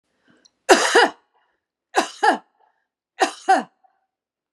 {
  "three_cough_length": "4.5 s",
  "three_cough_amplitude": 32767,
  "three_cough_signal_mean_std_ratio": 0.33,
  "survey_phase": "beta (2021-08-13 to 2022-03-07)",
  "age": "45-64",
  "gender": "Male",
  "wearing_mask": "No",
  "symptom_none": true,
  "symptom_onset": "2 days",
  "smoker_status": "Never smoked",
  "respiratory_condition_asthma": false,
  "respiratory_condition_other": false,
  "recruitment_source": "Test and Trace",
  "submission_delay": "1 day",
  "covid_test_result": "Positive",
  "covid_test_method": "ePCR"
}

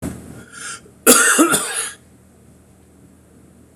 {
  "cough_length": "3.8 s",
  "cough_amplitude": 26028,
  "cough_signal_mean_std_ratio": 0.4,
  "survey_phase": "beta (2021-08-13 to 2022-03-07)",
  "age": "65+",
  "gender": "Male",
  "wearing_mask": "No",
  "symptom_cough_any": true,
  "symptom_runny_or_blocked_nose": true,
  "smoker_status": "Never smoked",
  "respiratory_condition_asthma": false,
  "respiratory_condition_other": false,
  "recruitment_source": "REACT",
  "submission_delay": "1 day",
  "covid_test_result": "Negative",
  "covid_test_method": "RT-qPCR"
}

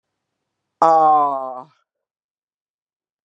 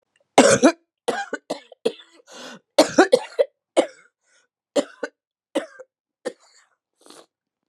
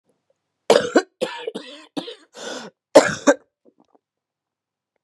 {
  "exhalation_length": "3.2 s",
  "exhalation_amplitude": 29546,
  "exhalation_signal_mean_std_ratio": 0.36,
  "three_cough_length": "7.7 s",
  "three_cough_amplitude": 32495,
  "three_cough_signal_mean_std_ratio": 0.29,
  "cough_length": "5.0 s",
  "cough_amplitude": 32768,
  "cough_signal_mean_std_ratio": 0.27,
  "survey_phase": "beta (2021-08-13 to 2022-03-07)",
  "age": "45-64",
  "gender": "Female",
  "wearing_mask": "No",
  "symptom_cough_any": true,
  "symptom_runny_or_blocked_nose": true,
  "smoker_status": "Never smoked",
  "respiratory_condition_asthma": false,
  "respiratory_condition_other": false,
  "recruitment_source": "Test and Trace",
  "submission_delay": "-1 day",
  "covid_test_result": "Positive",
  "covid_test_method": "LFT"
}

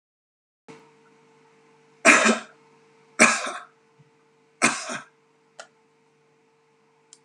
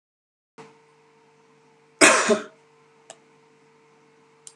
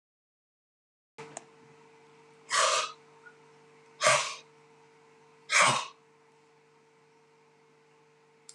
{
  "three_cough_length": "7.2 s",
  "three_cough_amplitude": 30742,
  "three_cough_signal_mean_std_ratio": 0.26,
  "cough_length": "4.6 s",
  "cough_amplitude": 32744,
  "cough_signal_mean_std_ratio": 0.23,
  "exhalation_length": "8.5 s",
  "exhalation_amplitude": 13679,
  "exhalation_signal_mean_std_ratio": 0.3,
  "survey_phase": "beta (2021-08-13 to 2022-03-07)",
  "age": "65+",
  "gender": "Male",
  "wearing_mask": "No",
  "symptom_none": true,
  "smoker_status": "Ex-smoker",
  "respiratory_condition_asthma": false,
  "respiratory_condition_other": false,
  "recruitment_source": "REACT",
  "submission_delay": "3 days",
  "covid_test_result": "Negative",
  "covid_test_method": "RT-qPCR"
}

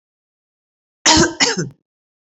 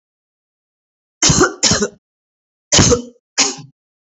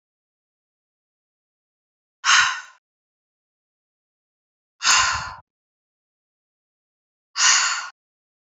{
  "cough_length": "2.3 s",
  "cough_amplitude": 31791,
  "cough_signal_mean_std_ratio": 0.36,
  "three_cough_length": "4.2 s",
  "three_cough_amplitude": 32445,
  "three_cough_signal_mean_std_ratio": 0.39,
  "exhalation_length": "8.5 s",
  "exhalation_amplitude": 27738,
  "exhalation_signal_mean_std_ratio": 0.29,
  "survey_phase": "beta (2021-08-13 to 2022-03-07)",
  "age": "45-64",
  "gender": "Female",
  "wearing_mask": "No",
  "symptom_none": true,
  "smoker_status": "Current smoker (e-cigarettes or vapes only)",
  "respiratory_condition_asthma": false,
  "respiratory_condition_other": false,
  "recruitment_source": "REACT",
  "submission_delay": "4 days",
  "covid_test_result": "Negative",
  "covid_test_method": "RT-qPCR",
  "influenza_a_test_result": "Negative",
  "influenza_b_test_result": "Negative"
}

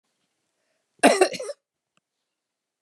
{
  "cough_length": "2.8 s",
  "cough_amplitude": 26289,
  "cough_signal_mean_std_ratio": 0.24,
  "survey_phase": "beta (2021-08-13 to 2022-03-07)",
  "age": "65+",
  "gender": "Female",
  "wearing_mask": "No",
  "symptom_none": true,
  "smoker_status": "Never smoked",
  "respiratory_condition_asthma": false,
  "respiratory_condition_other": false,
  "recruitment_source": "REACT",
  "submission_delay": "1 day",
  "covid_test_result": "Negative",
  "covid_test_method": "RT-qPCR"
}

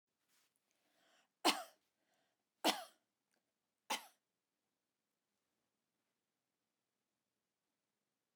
{
  "three_cough_length": "8.4 s",
  "three_cough_amplitude": 3702,
  "three_cough_signal_mean_std_ratio": 0.16,
  "survey_phase": "beta (2021-08-13 to 2022-03-07)",
  "age": "45-64",
  "gender": "Female",
  "wearing_mask": "No",
  "symptom_runny_or_blocked_nose": true,
  "smoker_status": "Never smoked",
  "respiratory_condition_asthma": false,
  "respiratory_condition_other": false,
  "recruitment_source": "REACT",
  "submission_delay": "2 days",
  "covid_test_result": "Negative",
  "covid_test_method": "RT-qPCR",
  "influenza_a_test_result": "Negative",
  "influenza_b_test_result": "Negative"
}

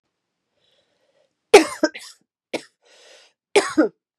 {
  "cough_length": "4.2 s",
  "cough_amplitude": 32768,
  "cough_signal_mean_std_ratio": 0.23,
  "survey_phase": "beta (2021-08-13 to 2022-03-07)",
  "age": "18-44",
  "gender": "Female",
  "wearing_mask": "No",
  "symptom_cough_any": true,
  "symptom_runny_or_blocked_nose": true,
  "symptom_shortness_of_breath": true,
  "symptom_fatigue": true,
  "symptom_headache": true,
  "symptom_onset": "2 days",
  "smoker_status": "Never smoked",
  "respiratory_condition_asthma": false,
  "respiratory_condition_other": false,
  "recruitment_source": "Test and Trace",
  "submission_delay": "1 day",
  "covid_test_result": "Positive",
  "covid_test_method": "RT-qPCR",
  "covid_ct_value": 16.4,
  "covid_ct_gene": "ORF1ab gene",
  "covid_ct_mean": 16.9,
  "covid_viral_load": "2900000 copies/ml",
  "covid_viral_load_category": "High viral load (>1M copies/ml)"
}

